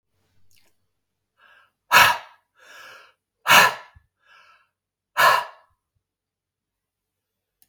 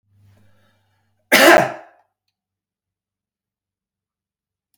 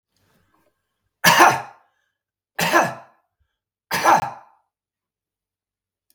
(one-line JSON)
{"exhalation_length": "7.7 s", "exhalation_amplitude": 32295, "exhalation_signal_mean_std_ratio": 0.25, "cough_length": "4.8 s", "cough_amplitude": 32768, "cough_signal_mean_std_ratio": 0.22, "three_cough_length": "6.1 s", "three_cough_amplitude": 32768, "three_cough_signal_mean_std_ratio": 0.3, "survey_phase": "beta (2021-08-13 to 2022-03-07)", "age": "45-64", "gender": "Male", "wearing_mask": "No", "symptom_none": true, "smoker_status": "Never smoked", "respiratory_condition_asthma": false, "respiratory_condition_other": false, "recruitment_source": "REACT", "submission_delay": "8 days", "covid_test_result": "Negative", "covid_test_method": "RT-qPCR", "influenza_a_test_result": "Negative", "influenza_b_test_result": "Negative"}